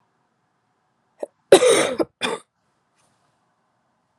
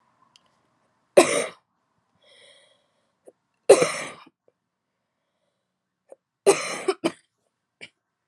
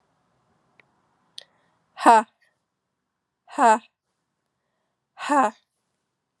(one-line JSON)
{"cough_length": "4.2 s", "cough_amplitude": 32768, "cough_signal_mean_std_ratio": 0.26, "three_cough_length": "8.3 s", "three_cough_amplitude": 31261, "three_cough_signal_mean_std_ratio": 0.22, "exhalation_length": "6.4 s", "exhalation_amplitude": 30603, "exhalation_signal_mean_std_ratio": 0.24, "survey_phase": "alpha (2021-03-01 to 2021-08-12)", "age": "18-44", "gender": "Female", "wearing_mask": "No", "symptom_cough_any": true, "symptom_shortness_of_breath": true, "symptom_fatigue": true, "symptom_fever_high_temperature": true, "symptom_headache": true, "smoker_status": "Never smoked", "respiratory_condition_asthma": true, "respiratory_condition_other": false, "recruitment_source": "Test and Trace", "submission_delay": "2 days", "covid_test_result": "Positive", "covid_test_method": "RT-qPCR"}